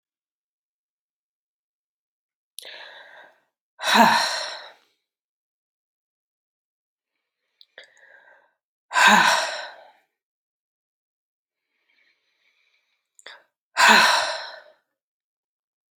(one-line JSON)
{"exhalation_length": "16.0 s", "exhalation_amplitude": 27494, "exhalation_signal_mean_std_ratio": 0.27, "survey_phase": "beta (2021-08-13 to 2022-03-07)", "age": "45-64", "gender": "Female", "wearing_mask": "No", "symptom_runny_or_blocked_nose": true, "symptom_other": true, "symptom_onset": "3 days", "smoker_status": "Never smoked", "respiratory_condition_asthma": false, "respiratory_condition_other": false, "recruitment_source": "Test and Trace", "submission_delay": "2 days", "covid_test_result": "Positive", "covid_test_method": "RT-qPCR", "covid_ct_value": 17.0, "covid_ct_gene": "ORF1ab gene", "covid_ct_mean": 17.5, "covid_viral_load": "1800000 copies/ml", "covid_viral_load_category": "High viral load (>1M copies/ml)"}